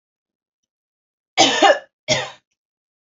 {"cough_length": "3.2 s", "cough_amplitude": 31475, "cough_signal_mean_std_ratio": 0.31, "survey_phase": "beta (2021-08-13 to 2022-03-07)", "age": "18-44", "gender": "Female", "wearing_mask": "No", "symptom_sore_throat": true, "symptom_onset": "12 days", "smoker_status": "Ex-smoker", "respiratory_condition_asthma": false, "respiratory_condition_other": false, "recruitment_source": "REACT", "submission_delay": "2 days", "covid_test_result": "Negative", "covid_test_method": "RT-qPCR", "influenza_a_test_result": "Negative", "influenza_b_test_result": "Negative"}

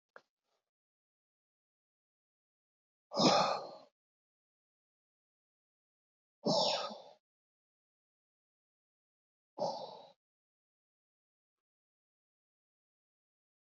{"exhalation_length": "13.7 s", "exhalation_amplitude": 6034, "exhalation_signal_mean_std_ratio": 0.22, "survey_phase": "beta (2021-08-13 to 2022-03-07)", "age": "45-64", "gender": "Male", "wearing_mask": "No", "symptom_cough_any": true, "symptom_runny_or_blocked_nose": true, "symptom_shortness_of_breath": true, "symptom_sore_throat": true, "symptom_headache": true, "symptom_change_to_sense_of_smell_or_taste": true, "smoker_status": "Ex-smoker", "respiratory_condition_asthma": false, "respiratory_condition_other": false, "recruitment_source": "Test and Trace", "submission_delay": "0 days", "covid_test_result": "Positive", "covid_test_method": "LFT"}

